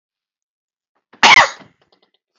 {
  "cough_length": "2.4 s",
  "cough_amplitude": 32388,
  "cough_signal_mean_std_ratio": 0.27,
  "survey_phase": "beta (2021-08-13 to 2022-03-07)",
  "age": "45-64",
  "gender": "Male",
  "wearing_mask": "No",
  "symptom_none": true,
  "smoker_status": "Never smoked",
  "respiratory_condition_asthma": false,
  "respiratory_condition_other": false,
  "recruitment_source": "REACT",
  "submission_delay": "1 day",
  "covid_test_result": "Negative",
  "covid_test_method": "RT-qPCR",
  "influenza_a_test_result": "Negative",
  "influenza_b_test_result": "Negative"
}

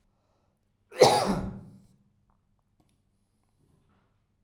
{
  "cough_length": "4.4 s",
  "cough_amplitude": 18876,
  "cough_signal_mean_std_ratio": 0.24,
  "survey_phase": "alpha (2021-03-01 to 2021-08-12)",
  "age": "45-64",
  "gender": "Male",
  "wearing_mask": "No",
  "symptom_none": true,
  "symptom_onset": "12 days",
  "smoker_status": "Never smoked",
  "respiratory_condition_asthma": false,
  "respiratory_condition_other": false,
  "recruitment_source": "REACT",
  "submission_delay": "1 day",
  "covid_test_result": "Negative",
  "covid_test_method": "RT-qPCR"
}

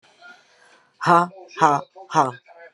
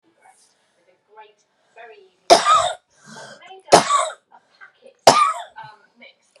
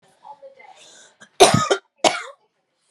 {
  "exhalation_length": "2.7 s",
  "exhalation_amplitude": 30100,
  "exhalation_signal_mean_std_ratio": 0.37,
  "three_cough_length": "6.4 s",
  "three_cough_amplitude": 32768,
  "three_cough_signal_mean_std_ratio": 0.31,
  "cough_length": "2.9 s",
  "cough_amplitude": 32768,
  "cough_signal_mean_std_ratio": 0.3,
  "survey_phase": "beta (2021-08-13 to 2022-03-07)",
  "age": "45-64",
  "gender": "Female",
  "wearing_mask": "No",
  "symptom_cough_any": true,
  "symptom_runny_or_blocked_nose": true,
  "symptom_sore_throat": true,
  "symptom_fever_high_temperature": true,
  "symptom_headache": true,
  "symptom_loss_of_taste": true,
  "smoker_status": "Never smoked",
  "respiratory_condition_asthma": true,
  "respiratory_condition_other": false,
  "recruitment_source": "Test and Trace",
  "submission_delay": "1 day",
  "covid_test_result": "Positive",
  "covid_test_method": "RT-qPCR",
  "covid_ct_value": 21.7,
  "covid_ct_gene": "ORF1ab gene",
  "covid_ct_mean": 22.0,
  "covid_viral_load": "60000 copies/ml",
  "covid_viral_load_category": "Low viral load (10K-1M copies/ml)"
}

